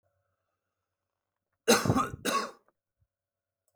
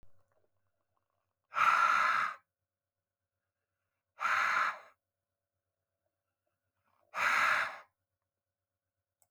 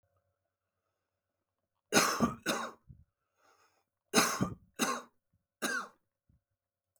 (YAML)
cough_length: 3.8 s
cough_amplitude: 13321
cough_signal_mean_std_ratio: 0.3
exhalation_length: 9.3 s
exhalation_amplitude: 5538
exhalation_signal_mean_std_ratio: 0.37
three_cough_length: 7.0 s
three_cough_amplitude: 10206
three_cough_signal_mean_std_ratio: 0.33
survey_phase: beta (2021-08-13 to 2022-03-07)
age: 45-64
gender: Male
wearing_mask: 'No'
symptom_none: true
smoker_status: Current smoker (11 or more cigarettes per day)
respiratory_condition_asthma: false
respiratory_condition_other: true
recruitment_source: REACT
submission_delay: 9 days
covid_test_result: Negative
covid_test_method: RT-qPCR